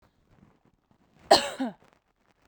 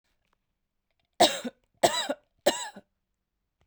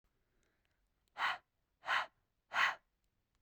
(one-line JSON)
{"cough_length": "2.5 s", "cough_amplitude": 23642, "cough_signal_mean_std_ratio": 0.22, "three_cough_length": "3.7 s", "three_cough_amplitude": 15058, "three_cough_signal_mean_std_ratio": 0.28, "exhalation_length": "3.4 s", "exhalation_amplitude": 3318, "exhalation_signal_mean_std_ratio": 0.33, "survey_phase": "beta (2021-08-13 to 2022-03-07)", "age": "18-44", "gender": "Female", "wearing_mask": "No", "symptom_fatigue": true, "smoker_status": "Never smoked", "respiratory_condition_asthma": false, "respiratory_condition_other": false, "recruitment_source": "REACT", "submission_delay": "2 days", "covid_test_result": "Negative", "covid_test_method": "RT-qPCR", "influenza_a_test_result": "Negative", "influenza_b_test_result": "Negative"}